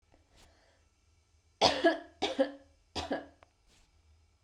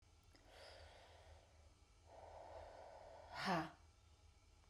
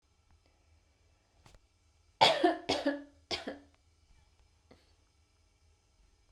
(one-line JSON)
{"three_cough_length": "4.4 s", "three_cough_amplitude": 13006, "three_cough_signal_mean_std_ratio": 0.31, "exhalation_length": "4.7 s", "exhalation_amplitude": 1081, "exhalation_signal_mean_std_ratio": 0.46, "cough_length": "6.3 s", "cough_amplitude": 12781, "cough_signal_mean_std_ratio": 0.26, "survey_phase": "beta (2021-08-13 to 2022-03-07)", "age": "18-44", "gender": "Female", "wearing_mask": "No", "symptom_abdominal_pain": true, "smoker_status": "Never smoked", "respiratory_condition_asthma": false, "respiratory_condition_other": false, "recruitment_source": "REACT", "submission_delay": "1 day", "covid_test_result": "Negative", "covid_test_method": "RT-qPCR"}